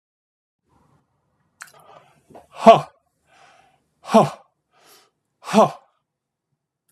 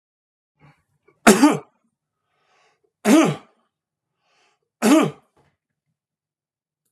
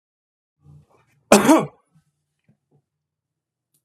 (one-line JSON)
{"exhalation_length": "6.9 s", "exhalation_amplitude": 32768, "exhalation_signal_mean_std_ratio": 0.21, "three_cough_length": "6.9 s", "three_cough_amplitude": 32767, "three_cough_signal_mean_std_ratio": 0.27, "cough_length": "3.8 s", "cough_amplitude": 32768, "cough_signal_mean_std_ratio": 0.21, "survey_phase": "beta (2021-08-13 to 2022-03-07)", "age": "65+", "gender": "Male", "wearing_mask": "No", "symptom_none": true, "smoker_status": "Ex-smoker", "respiratory_condition_asthma": false, "respiratory_condition_other": false, "recruitment_source": "REACT", "submission_delay": "1 day", "covid_test_result": "Negative", "covid_test_method": "RT-qPCR"}